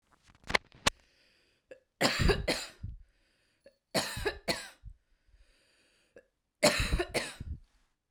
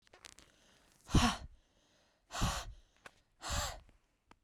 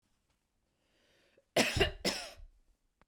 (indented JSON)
{
  "three_cough_length": "8.1 s",
  "three_cough_amplitude": 13954,
  "three_cough_signal_mean_std_ratio": 0.36,
  "exhalation_length": "4.4 s",
  "exhalation_amplitude": 5591,
  "exhalation_signal_mean_std_ratio": 0.34,
  "cough_length": "3.1 s",
  "cough_amplitude": 7294,
  "cough_signal_mean_std_ratio": 0.32,
  "survey_phase": "beta (2021-08-13 to 2022-03-07)",
  "age": "18-44",
  "gender": "Female",
  "wearing_mask": "No",
  "symptom_runny_or_blocked_nose": true,
  "smoker_status": "Never smoked",
  "respiratory_condition_asthma": false,
  "respiratory_condition_other": false,
  "recruitment_source": "REACT",
  "submission_delay": "1 day",
  "covid_test_result": "Negative",
  "covid_test_method": "RT-qPCR",
  "influenza_a_test_result": "Negative",
  "influenza_b_test_result": "Negative"
}